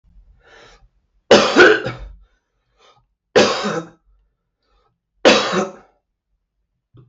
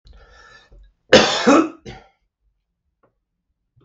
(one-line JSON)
{"three_cough_length": "7.1 s", "three_cough_amplitude": 32768, "three_cough_signal_mean_std_ratio": 0.33, "cough_length": "3.8 s", "cough_amplitude": 32768, "cough_signal_mean_std_ratio": 0.29, "survey_phase": "beta (2021-08-13 to 2022-03-07)", "age": "45-64", "gender": "Male", "wearing_mask": "No", "symptom_cough_any": true, "symptom_runny_or_blocked_nose": true, "symptom_fatigue": true, "symptom_onset": "13 days", "smoker_status": "Ex-smoker", "respiratory_condition_asthma": false, "respiratory_condition_other": false, "recruitment_source": "REACT", "submission_delay": "1 day", "covid_test_result": "Negative", "covid_test_method": "RT-qPCR", "influenza_a_test_result": "Negative", "influenza_b_test_result": "Negative"}